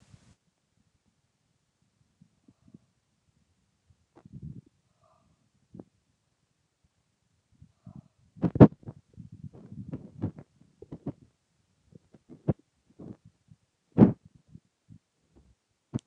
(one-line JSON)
{"exhalation_length": "16.1 s", "exhalation_amplitude": 29176, "exhalation_signal_mean_std_ratio": 0.13, "survey_phase": "beta (2021-08-13 to 2022-03-07)", "age": "65+", "gender": "Male", "wearing_mask": "No", "symptom_fatigue": true, "symptom_headache": true, "smoker_status": "Ex-smoker", "respiratory_condition_asthma": false, "respiratory_condition_other": false, "recruitment_source": "REACT", "submission_delay": "2 days", "covid_test_result": "Negative", "covid_test_method": "RT-qPCR", "influenza_a_test_result": "Unknown/Void", "influenza_b_test_result": "Unknown/Void"}